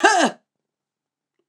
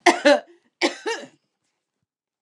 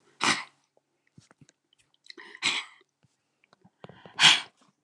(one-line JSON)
{"cough_length": "1.5 s", "cough_amplitude": 28708, "cough_signal_mean_std_ratio": 0.34, "three_cough_length": "2.4 s", "three_cough_amplitude": 29203, "three_cough_signal_mean_std_ratio": 0.32, "exhalation_length": "4.8 s", "exhalation_amplitude": 23713, "exhalation_signal_mean_std_ratio": 0.25, "survey_phase": "alpha (2021-03-01 to 2021-08-12)", "age": "65+", "gender": "Female", "wearing_mask": "No", "symptom_none": true, "smoker_status": "Ex-smoker", "respiratory_condition_asthma": false, "respiratory_condition_other": false, "recruitment_source": "REACT", "submission_delay": "1 day", "covid_test_result": "Negative", "covid_test_method": "RT-qPCR"}